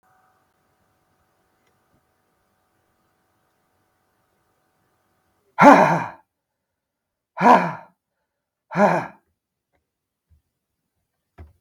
exhalation_length: 11.6 s
exhalation_amplitude: 32768
exhalation_signal_mean_std_ratio: 0.21
survey_phase: beta (2021-08-13 to 2022-03-07)
age: 65+
gender: Male
wearing_mask: 'No'
symptom_cough_any: true
symptom_runny_or_blocked_nose: true
smoker_status: Never smoked
respiratory_condition_asthma: false
respiratory_condition_other: false
recruitment_source: Test and Trace
submission_delay: 1 day
covid_test_result: Positive
covid_test_method: RT-qPCR
covid_ct_value: 19.6
covid_ct_gene: ORF1ab gene
covid_ct_mean: 20.1
covid_viral_load: 250000 copies/ml
covid_viral_load_category: Low viral load (10K-1M copies/ml)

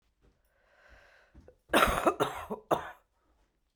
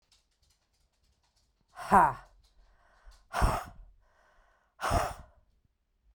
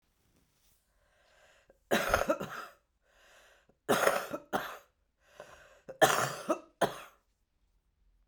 cough_length: 3.8 s
cough_amplitude: 12682
cough_signal_mean_std_ratio: 0.33
exhalation_length: 6.1 s
exhalation_amplitude: 12341
exhalation_signal_mean_std_ratio: 0.28
three_cough_length: 8.3 s
three_cough_amplitude: 12542
three_cough_signal_mean_std_ratio: 0.34
survey_phase: beta (2021-08-13 to 2022-03-07)
age: 45-64
gender: Female
wearing_mask: 'No'
symptom_runny_or_blocked_nose: true
symptom_sore_throat: true
symptom_abdominal_pain: true
symptom_fatigue: true
symptom_headache: true
symptom_loss_of_taste: true
smoker_status: Current smoker (11 or more cigarettes per day)
respiratory_condition_asthma: false
respiratory_condition_other: false
recruitment_source: Test and Trace
submission_delay: 2 days
covid_test_result: Positive
covid_test_method: RT-qPCR
covid_ct_value: 16.6
covid_ct_gene: N gene
covid_ct_mean: 17.7
covid_viral_load: 1600000 copies/ml
covid_viral_load_category: High viral load (>1M copies/ml)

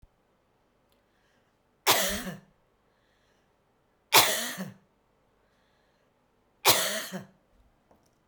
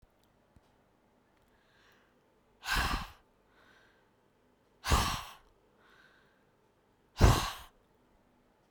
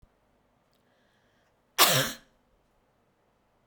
three_cough_length: 8.3 s
three_cough_amplitude: 24655
three_cough_signal_mean_std_ratio: 0.28
exhalation_length: 8.7 s
exhalation_amplitude: 11424
exhalation_signal_mean_std_ratio: 0.26
cough_length: 3.7 s
cough_amplitude: 21186
cough_signal_mean_std_ratio: 0.23
survey_phase: beta (2021-08-13 to 2022-03-07)
age: 65+
gender: Female
wearing_mask: 'No'
symptom_none: true
smoker_status: Ex-smoker
respiratory_condition_asthma: false
respiratory_condition_other: false
recruitment_source: REACT
submission_delay: 3 days
covid_test_result: Negative
covid_test_method: RT-qPCR
influenza_a_test_result: Negative
influenza_b_test_result: Negative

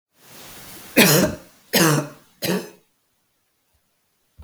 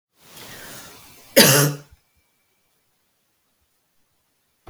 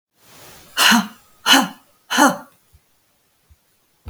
three_cough_length: 4.4 s
three_cough_amplitude: 32767
three_cough_signal_mean_std_ratio: 0.37
cough_length: 4.7 s
cough_amplitude: 32768
cough_signal_mean_std_ratio: 0.24
exhalation_length: 4.1 s
exhalation_amplitude: 32768
exhalation_signal_mean_std_ratio: 0.35
survey_phase: beta (2021-08-13 to 2022-03-07)
age: 45-64
gender: Female
wearing_mask: 'No'
symptom_sore_throat: true
symptom_fatigue: true
symptom_change_to_sense_of_smell_or_taste: true
symptom_other: true
symptom_onset: 5 days
smoker_status: Never smoked
respiratory_condition_asthma: true
respiratory_condition_other: false
recruitment_source: Test and Trace
submission_delay: 1 day
covid_test_result: Positive
covid_test_method: RT-qPCR
covid_ct_value: 26.5
covid_ct_gene: ORF1ab gene
covid_ct_mean: 26.7
covid_viral_load: 1800 copies/ml
covid_viral_load_category: Minimal viral load (< 10K copies/ml)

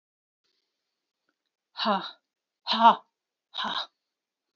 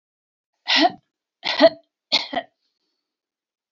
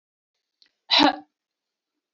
exhalation_length: 4.6 s
exhalation_amplitude: 18574
exhalation_signal_mean_std_ratio: 0.26
three_cough_length: 3.7 s
three_cough_amplitude: 25364
three_cough_signal_mean_std_ratio: 0.29
cough_length: 2.1 s
cough_amplitude: 19811
cough_signal_mean_std_ratio: 0.25
survey_phase: beta (2021-08-13 to 2022-03-07)
age: 45-64
gender: Female
wearing_mask: 'No'
symptom_sore_throat: true
smoker_status: Never smoked
respiratory_condition_asthma: false
respiratory_condition_other: false
recruitment_source: Test and Trace
submission_delay: 2 days
covid_test_result: Positive
covid_test_method: RT-qPCR
covid_ct_value: 18.3
covid_ct_gene: ORF1ab gene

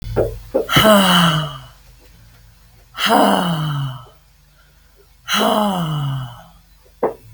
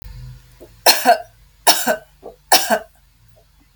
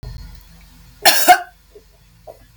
exhalation_length: 7.3 s
exhalation_amplitude: 32768
exhalation_signal_mean_std_ratio: 0.58
three_cough_length: 3.8 s
three_cough_amplitude: 32768
three_cough_signal_mean_std_ratio: 0.37
cough_length: 2.6 s
cough_amplitude: 32768
cough_signal_mean_std_ratio: 0.32
survey_phase: beta (2021-08-13 to 2022-03-07)
age: 45-64
gender: Female
wearing_mask: 'No'
symptom_none: true
smoker_status: Never smoked
respiratory_condition_asthma: false
respiratory_condition_other: false
recruitment_source: REACT
submission_delay: 2 days
covid_test_method: RT-qPCR
influenza_a_test_result: Unknown/Void
influenza_b_test_result: Unknown/Void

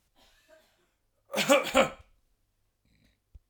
cough_length: 3.5 s
cough_amplitude: 13737
cough_signal_mean_std_ratio: 0.28
survey_phase: alpha (2021-03-01 to 2021-08-12)
age: 45-64
gender: Male
wearing_mask: 'No'
symptom_none: true
smoker_status: Ex-smoker
respiratory_condition_asthma: false
respiratory_condition_other: false
recruitment_source: REACT
submission_delay: 3 days
covid_test_result: Negative
covid_test_method: RT-qPCR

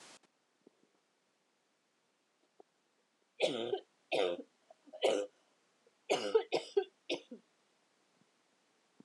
three_cough_length: 9.0 s
three_cough_amplitude: 4375
three_cough_signal_mean_std_ratio: 0.31
survey_phase: alpha (2021-03-01 to 2021-08-12)
age: 18-44
gender: Female
wearing_mask: 'No'
symptom_cough_any: true
symptom_fatigue: true
symptom_headache: true
symptom_change_to_sense_of_smell_or_taste: true
symptom_onset: 3 days
smoker_status: Never smoked
respiratory_condition_asthma: false
respiratory_condition_other: false
recruitment_source: Test and Trace
submission_delay: 2 days
covid_test_result: Positive
covid_test_method: RT-qPCR
covid_ct_value: 20.3
covid_ct_gene: ORF1ab gene
covid_ct_mean: 20.5
covid_viral_load: 200000 copies/ml
covid_viral_load_category: Low viral load (10K-1M copies/ml)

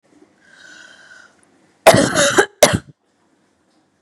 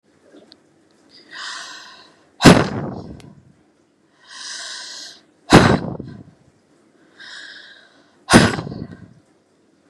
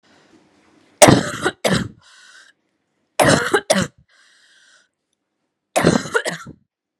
cough_length: 4.0 s
cough_amplitude: 32768
cough_signal_mean_std_ratio: 0.32
exhalation_length: 9.9 s
exhalation_amplitude: 32768
exhalation_signal_mean_std_ratio: 0.28
three_cough_length: 7.0 s
three_cough_amplitude: 32768
three_cough_signal_mean_std_ratio: 0.34
survey_phase: beta (2021-08-13 to 2022-03-07)
age: 18-44
gender: Female
wearing_mask: 'No'
symptom_cough_any: true
symptom_runny_or_blocked_nose: true
symptom_shortness_of_breath: true
symptom_sore_throat: true
symptom_abdominal_pain: true
symptom_fatigue: true
symptom_headache: true
symptom_onset: 3 days
smoker_status: Never smoked
respiratory_condition_asthma: true
respiratory_condition_other: false
recruitment_source: Test and Trace
submission_delay: 1 day
covid_test_result: Positive
covid_test_method: RT-qPCR
covid_ct_value: 21.4
covid_ct_gene: ORF1ab gene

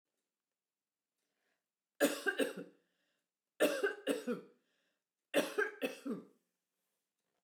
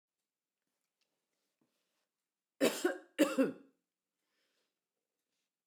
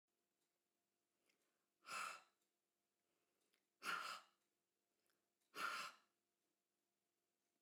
three_cough_length: 7.4 s
three_cough_amplitude: 4392
three_cough_signal_mean_std_ratio: 0.35
cough_length: 5.7 s
cough_amplitude: 5124
cough_signal_mean_std_ratio: 0.23
exhalation_length: 7.6 s
exhalation_amplitude: 643
exhalation_signal_mean_std_ratio: 0.3
survey_phase: beta (2021-08-13 to 2022-03-07)
age: 65+
gender: Female
wearing_mask: 'No'
symptom_runny_or_blocked_nose: true
smoker_status: Never smoked
respiratory_condition_asthma: false
respiratory_condition_other: false
recruitment_source: REACT
submission_delay: 2 days
covid_test_result: Negative
covid_test_method: RT-qPCR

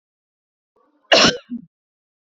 cough_length: 2.2 s
cough_amplitude: 28179
cough_signal_mean_std_ratio: 0.28
survey_phase: beta (2021-08-13 to 2022-03-07)
age: 65+
gender: Female
wearing_mask: 'No'
symptom_none: true
smoker_status: Never smoked
respiratory_condition_asthma: false
respiratory_condition_other: false
recruitment_source: REACT
submission_delay: 2 days
covid_test_result: Negative
covid_test_method: RT-qPCR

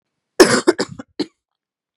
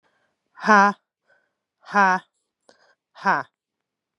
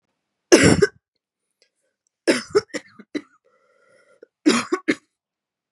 cough_length: 2.0 s
cough_amplitude: 32768
cough_signal_mean_std_ratio: 0.3
exhalation_length: 4.2 s
exhalation_amplitude: 28341
exhalation_signal_mean_std_ratio: 0.28
three_cough_length: 5.7 s
three_cough_amplitude: 32768
three_cough_signal_mean_std_ratio: 0.29
survey_phase: beta (2021-08-13 to 2022-03-07)
age: 18-44
gender: Female
wearing_mask: 'No'
symptom_cough_any: true
symptom_runny_or_blocked_nose: true
symptom_shortness_of_breath: true
symptom_sore_throat: true
symptom_abdominal_pain: true
symptom_fatigue: true
symptom_headache: true
symptom_other: true
symptom_onset: 3 days
smoker_status: Never smoked
respiratory_condition_asthma: true
respiratory_condition_other: false
recruitment_source: Test and Trace
submission_delay: 2 days
covid_test_result: Positive
covid_test_method: RT-qPCR
covid_ct_value: 31.7
covid_ct_gene: ORF1ab gene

